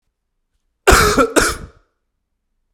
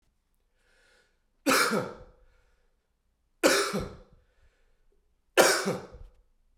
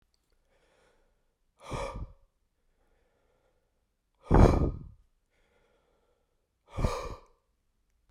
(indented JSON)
{
  "cough_length": "2.7 s",
  "cough_amplitude": 32768,
  "cough_signal_mean_std_ratio": 0.37,
  "three_cough_length": "6.6 s",
  "three_cough_amplitude": 18965,
  "three_cough_signal_mean_std_ratio": 0.34,
  "exhalation_length": "8.1 s",
  "exhalation_amplitude": 17404,
  "exhalation_signal_mean_std_ratio": 0.24,
  "survey_phase": "beta (2021-08-13 to 2022-03-07)",
  "age": "18-44",
  "gender": "Male",
  "wearing_mask": "No",
  "symptom_cough_any": true,
  "symptom_runny_or_blocked_nose": true,
  "symptom_fatigue": true,
  "symptom_headache": true,
  "smoker_status": "Prefer not to say",
  "respiratory_condition_asthma": false,
  "respiratory_condition_other": false,
  "recruitment_source": "Test and Trace",
  "submission_delay": "3 days",
  "covid_test_result": "Positive",
  "covid_test_method": "LFT"
}